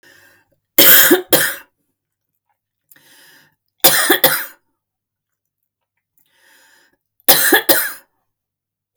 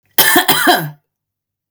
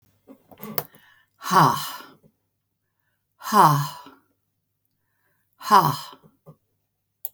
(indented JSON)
{
  "three_cough_length": "9.0 s",
  "three_cough_amplitude": 32768,
  "three_cough_signal_mean_std_ratio": 0.33,
  "cough_length": "1.7 s",
  "cough_amplitude": 32768,
  "cough_signal_mean_std_ratio": 0.52,
  "exhalation_length": "7.3 s",
  "exhalation_amplitude": 26251,
  "exhalation_signal_mean_std_ratio": 0.3,
  "survey_phase": "beta (2021-08-13 to 2022-03-07)",
  "age": "45-64",
  "gender": "Female",
  "wearing_mask": "No",
  "symptom_none": true,
  "smoker_status": "Ex-smoker",
  "respiratory_condition_asthma": false,
  "respiratory_condition_other": false,
  "recruitment_source": "REACT",
  "submission_delay": "3 days",
  "covid_test_result": "Negative",
  "covid_test_method": "RT-qPCR"
}